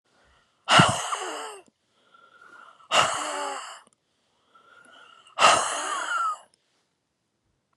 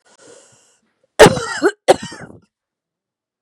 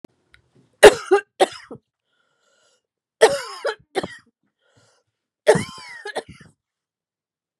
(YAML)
exhalation_length: 7.8 s
exhalation_amplitude: 26460
exhalation_signal_mean_std_ratio: 0.38
cough_length: 3.4 s
cough_amplitude: 32768
cough_signal_mean_std_ratio: 0.26
three_cough_length: 7.6 s
three_cough_amplitude: 32768
three_cough_signal_mean_std_ratio: 0.22
survey_phase: beta (2021-08-13 to 2022-03-07)
age: 45-64
gender: Female
wearing_mask: 'No'
symptom_none: true
smoker_status: Never smoked
respiratory_condition_asthma: false
respiratory_condition_other: false
recruitment_source: REACT
submission_delay: 3 days
covid_test_result: Negative
covid_test_method: RT-qPCR
influenza_a_test_result: Negative
influenza_b_test_result: Negative